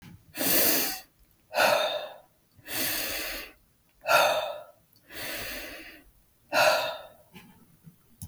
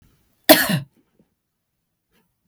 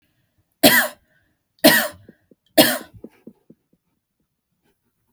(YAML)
exhalation_length: 8.3 s
exhalation_amplitude: 12187
exhalation_signal_mean_std_ratio: 0.51
cough_length: 2.5 s
cough_amplitude: 32768
cough_signal_mean_std_ratio: 0.23
three_cough_length: 5.1 s
three_cough_amplitude: 32768
three_cough_signal_mean_std_ratio: 0.27
survey_phase: beta (2021-08-13 to 2022-03-07)
age: 18-44
gender: Female
wearing_mask: 'No'
symptom_none: true
smoker_status: Never smoked
respiratory_condition_asthma: false
respiratory_condition_other: false
recruitment_source: REACT
submission_delay: 4 days
covid_test_result: Negative
covid_test_method: RT-qPCR
influenza_a_test_result: Negative
influenza_b_test_result: Negative